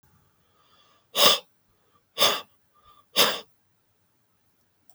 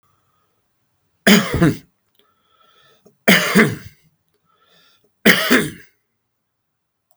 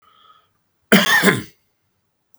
{
  "exhalation_length": "4.9 s",
  "exhalation_amplitude": 28900,
  "exhalation_signal_mean_std_ratio": 0.28,
  "three_cough_length": "7.2 s",
  "three_cough_amplitude": 32768,
  "three_cough_signal_mean_std_ratio": 0.32,
  "cough_length": "2.4 s",
  "cough_amplitude": 32768,
  "cough_signal_mean_std_ratio": 0.35,
  "survey_phase": "beta (2021-08-13 to 2022-03-07)",
  "age": "65+",
  "gender": "Male",
  "wearing_mask": "No",
  "symptom_none": true,
  "smoker_status": "Ex-smoker",
  "respiratory_condition_asthma": false,
  "respiratory_condition_other": false,
  "recruitment_source": "REACT",
  "submission_delay": "1 day",
  "covid_test_result": "Negative",
  "covid_test_method": "RT-qPCR",
  "influenza_a_test_result": "Negative",
  "influenza_b_test_result": "Negative"
}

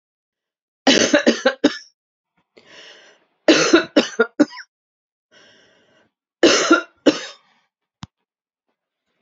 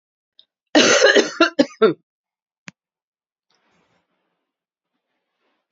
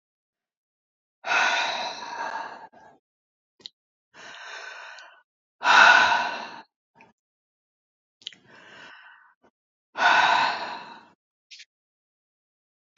{
  "three_cough_length": "9.2 s",
  "three_cough_amplitude": 29555,
  "three_cough_signal_mean_std_ratio": 0.33,
  "cough_length": "5.7 s",
  "cough_amplitude": 29323,
  "cough_signal_mean_std_ratio": 0.29,
  "exhalation_length": "13.0 s",
  "exhalation_amplitude": 24193,
  "exhalation_signal_mean_std_ratio": 0.33,
  "survey_phase": "beta (2021-08-13 to 2022-03-07)",
  "age": "65+",
  "gender": "Female",
  "wearing_mask": "No",
  "symptom_none": true,
  "smoker_status": "Prefer not to say",
  "respiratory_condition_asthma": false,
  "respiratory_condition_other": false,
  "recruitment_source": "REACT",
  "submission_delay": "2 days",
  "covid_test_result": "Negative",
  "covid_test_method": "RT-qPCR",
  "influenza_a_test_result": "Unknown/Void",
  "influenza_b_test_result": "Unknown/Void"
}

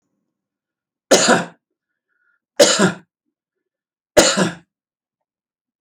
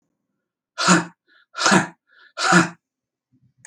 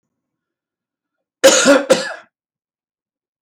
{
  "three_cough_length": "5.8 s",
  "three_cough_amplitude": 32511,
  "three_cough_signal_mean_std_ratio": 0.31,
  "exhalation_length": "3.7 s",
  "exhalation_amplitude": 27933,
  "exhalation_signal_mean_std_ratio": 0.37,
  "cough_length": "3.4 s",
  "cough_amplitude": 32768,
  "cough_signal_mean_std_ratio": 0.32,
  "survey_phase": "beta (2021-08-13 to 2022-03-07)",
  "age": "65+",
  "gender": "Male",
  "wearing_mask": "No",
  "symptom_none": true,
  "smoker_status": "Never smoked",
  "respiratory_condition_asthma": false,
  "respiratory_condition_other": false,
  "recruitment_source": "REACT",
  "submission_delay": "1 day",
  "covid_test_result": "Negative",
  "covid_test_method": "RT-qPCR"
}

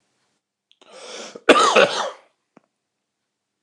{
  "cough_length": "3.6 s",
  "cough_amplitude": 29204,
  "cough_signal_mean_std_ratio": 0.31,
  "survey_phase": "beta (2021-08-13 to 2022-03-07)",
  "age": "45-64",
  "gender": "Male",
  "wearing_mask": "No",
  "symptom_cough_any": true,
  "symptom_shortness_of_breath": true,
  "symptom_onset": "9 days",
  "smoker_status": "Never smoked",
  "respiratory_condition_asthma": true,
  "respiratory_condition_other": false,
  "recruitment_source": "REACT",
  "submission_delay": "1 day",
  "covid_test_result": "Negative",
  "covid_test_method": "RT-qPCR"
}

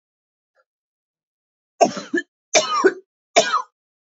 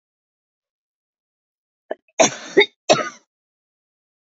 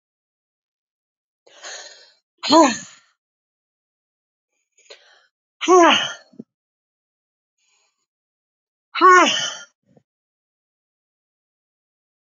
{
  "three_cough_length": "4.1 s",
  "three_cough_amplitude": 28830,
  "three_cough_signal_mean_std_ratio": 0.33,
  "cough_length": "4.3 s",
  "cough_amplitude": 27283,
  "cough_signal_mean_std_ratio": 0.22,
  "exhalation_length": "12.4 s",
  "exhalation_amplitude": 27657,
  "exhalation_signal_mean_std_ratio": 0.24,
  "survey_phase": "beta (2021-08-13 to 2022-03-07)",
  "age": "45-64",
  "gender": "Female",
  "wearing_mask": "No",
  "symptom_cough_any": true,
  "symptom_new_continuous_cough": true,
  "symptom_runny_or_blocked_nose": true,
  "symptom_diarrhoea": true,
  "symptom_fatigue": true,
  "symptom_change_to_sense_of_smell_or_taste": true,
  "symptom_loss_of_taste": true,
  "symptom_onset": "5 days",
  "smoker_status": "Current smoker (1 to 10 cigarettes per day)",
  "respiratory_condition_asthma": false,
  "respiratory_condition_other": false,
  "recruitment_source": "Test and Trace",
  "submission_delay": "3 days",
  "covid_test_result": "Positive",
  "covid_test_method": "RT-qPCR",
  "covid_ct_value": 17.3,
  "covid_ct_gene": "ORF1ab gene",
  "covid_ct_mean": 17.7,
  "covid_viral_load": "1600000 copies/ml",
  "covid_viral_load_category": "High viral load (>1M copies/ml)"
}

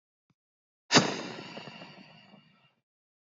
{
  "exhalation_length": "3.2 s",
  "exhalation_amplitude": 16975,
  "exhalation_signal_mean_std_ratio": 0.25,
  "survey_phase": "beta (2021-08-13 to 2022-03-07)",
  "age": "18-44",
  "gender": "Male",
  "wearing_mask": "No",
  "symptom_none": true,
  "smoker_status": "Never smoked",
  "respiratory_condition_asthma": true,
  "respiratory_condition_other": false,
  "recruitment_source": "REACT",
  "submission_delay": "3 days",
  "covid_test_result": "Negative",
  "covid_test_method": "RT-qPCR",
  "influenza_a_test_result": "Negative",
  "influenza_b_test_result": "Negative"
}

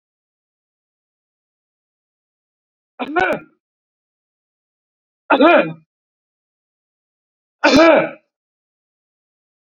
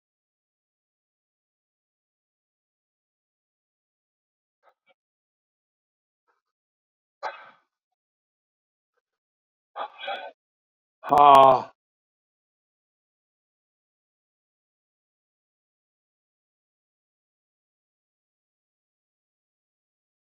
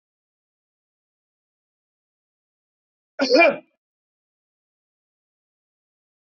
{
  "three_cough_length": "9.6 s",
  "three_cough_amplitude": 28672,
  "three_cough_signal_mean_std_ratio": 0.26,
  "exhalation_length": "20.3 s",
  "exhalation_amplitude": 27150,
  "exhalation_signal_mean_std_ratio": 0.13,
  "cough_length": "6.2 s",
  "cough_amplitude": 21579,
  "cough_signal_mean_std_ratio": 0.18,
  "survey_phase": "beta (2021-08-13 to 2022-03-07)",
  "age": "65+",
  "gender": "Male",
  "wearing_mask": "No",
  "symptom_runny_or_blocked_nose": true,
  "symptom_abdominal_pain": true,
  "smoker_status": "Never smoked",
  "respiratory_condition_asthma": false,
  "respiratory_condition_other": false,
  "recruitment_source": "REACT",
  "submission_delay": "1 day",
  "covid_test_result": "Negative",
  "covid_test_method": "RT-qPCR",
  "influenza_a_test_result": "Negative",
  "influenza_b_test_result": "Negative"
}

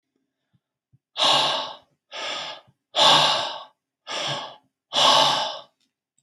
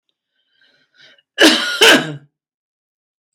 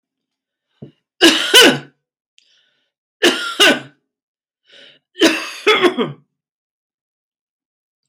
{
  "exhalation_length": "6.2 s",
  "exhalation_amplitude": 22905,
  "exhalation_signal_mean_std_ratio": 0.48,
  "cough_length": "3.3 s",
  "cough_amplitude": 32767,
  "cough_signal_mean_std_ratio": 0.34,
  "three_cough_length": "8.1 s",
  "three_cough_amplitude": 32767,
  "three_cough_signal_mean_std_ratio": 0.35,
  "survey_phase": "beta (2021-08-13 to 2022-03-07)",
  "age": "65+",
  "gender": "Male",
  "wearing_mask": "No",
  "symptom_none": true,
  "smoker_status": "Ex-smoker",
  "respiratory_condition_asthma": false,
  "respiratory_condition_other": false,
  "recruitment_source": "REACT",
  "submission_delay": "1 day",
  "covid_test_result": "Negative",
  "covid_test_method": "RT-qPCR"
}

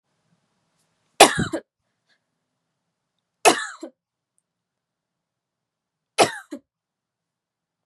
{
  "three_cough_length": "7.9 s",
  "three_cough_amplitude": 32768,
  "three_cough_signal_mean_std_ratio": 0.18,
  "survey_phase": "beta (2021-08-13 to 2022-03-07)",
  "age": "18-44",
  "gender": "Female",
  "wearing_mask": "No",
  "symptom_cough_any": true,
  "symptom_runny_or_blocked_nose": true,
  "symptom_sore_throat": true,
  "symptom_headache": true,
  "symptom_other": true,
  "symptom_onset": "4 days",
  "smoker_status": "Never smoked",
  "respiratory_condition_asthma": false,
  "respiratory_condition_other": false,
  "recruitment_source": "Test and Trace",
  "submission_delay": "2 days",
  "covid_test_result": "Positive",
  "covid_test_method": "ePCR"
}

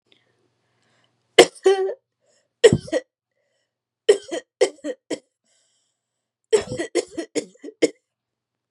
{
  "three_cough_length": "8.7 s",
  "three_cough_amplitude": 32768,
  "three_cough_signal_mean_std_ratio": 0.26,
  "survey_phase": "beta (2021-08-13 to 2022-03-07)",
  "age": "18-44",
  "gender": "Female",
  "wearing_mask": "No",
  "symptom_none": true,
  "smoker_status": "Never smoked",
  "respiratory_condition_asthma": false,
  "respiratory_condition_other": false,
  "recruitment_source": "Test and Trace",
  "submission_delay": "2 days",
  "covid_test_result": "Negative",
  "covid_test_method": "RT-qPCR"
}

